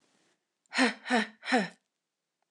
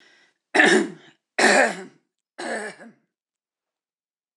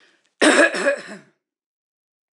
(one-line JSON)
{"exhalation_length": "2.5 s", "exhalation_amplitude": 7814, "exhalation_signal_mean_std_ratio": 0.37, "three_cough_length": "4.4 s", "three_cough_amplitude": 25634, "three_cough_signal_mean_std_ratio": 0.36, "cough_length": "2.3 s", "cough_amplitude": 24359, "cough_signal_mean_std_ratio": 0.38, "survey_phase": "alpha (2021-03-01 to 2021-08-12)", "age": "45-64", "gender": "Female", "wearing_mask": "No", "symptom_none": true, "symptom_onset": "12 days", "smoker_status": "Never smoked", "respiratory_condition_asthma": false, "respiratory_condition_other": false, "recruitment_source": "REACT", "submission_delay": "2 days", "covid_test_result": "Negative", "covid_test_method": "RT-qPCR"}